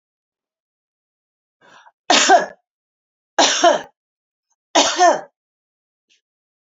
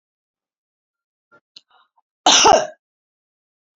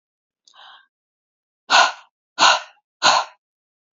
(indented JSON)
{
  "three_cough_length": "6.7 s",
  "three_cough_amplitude": 32649,
  "three_cough_signal_mean_std_ratio": 0.33,
  "cough_length": "3.8 s",
  "cough_amplitude": 31607,
  "cough_signal_mean_std_ratio": 0.26,
  "exhalation_length": "3.9 s",
  "exhalation_amplitude": 28162,
  "exhalation_signal_mean_std_ratio": 0.32,
  "survey_phase": "alpha (2021-03-01 to 2021-08-12)",
  "age": "45-64",
  "gender": "Female",
  "wearing_mask": "No",
  "symptom_none": true,
  "smoker_status": "Never smoked",
  "respiratory_condition_asthma": false,
  "respiratory_condition_other": false,
  "recruitment_source": "REACT",
  "submission_delay": "1 day",
  "covid_test_result": "Negative",
  "covid_test_method": "RT-qPCR"
}